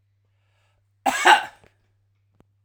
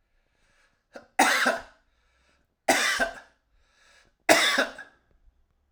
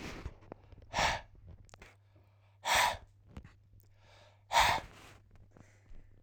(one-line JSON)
{"cough_length": "2.6 s", "cough_amplitude": 30810, "cough_signal_mean_std_ratio": 0.26, "three_cough_length": "5.7 s", "three_cough_amplitude": 26421, "three_cough_signal_mean_std_ratio": 0.37, "exhalation_length": "6.2 s", "exhalation_amplitude": 8025, "exhalation_signal_mean_std_ratio": 0.37, "survey_phase": "alpha (2021-03-01 to 2021-08-12)", "age": "45-64", "gender": "Male", "wearing_mask": "No", "symptom_change_to_sense_of_smell_or_taste": true, "smoker_status": "Never smoked", "respiratory_condition_asthma": false, "respiratory_condition_other": false, "recruitment_source": "REACT", "submission_delay": "3 days", "covid_test_result": "Negative", "covid_test_method": "RT-qPCR"}